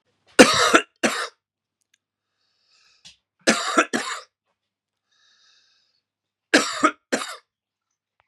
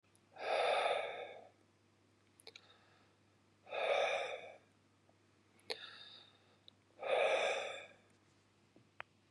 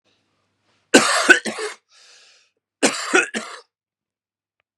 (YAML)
three_cough_length: 8.3 s
three_cough_amplitude: 32768
three_cough_signal_mean_std_ratio: 0.28
exhalation_length: 9.3 s
exhalation_amplitude: 3181
exhalation_signal_mean_std_ratio: 0.45
cough_length: 4.8 s
cough_amplitude: 32768
cough_signal_mean_std_ratio: 0.32
survey_phase: beta (2021-08-13 to 2022-03-07)
age: 45-64
gender: Male
wearing_mask: 'No'
symptom_none: true
smoker_status: Never smoked
respiratory_condition_asthma: false
respiratory_condition_other: false
recruitment_source: REACT
submission_delay: 3 days
covid_test_result: Negative
covid_test_method: RT-qPCR
influenza_a_test_result: Unknown/Void
influenza_b_test_result: Unknown/Void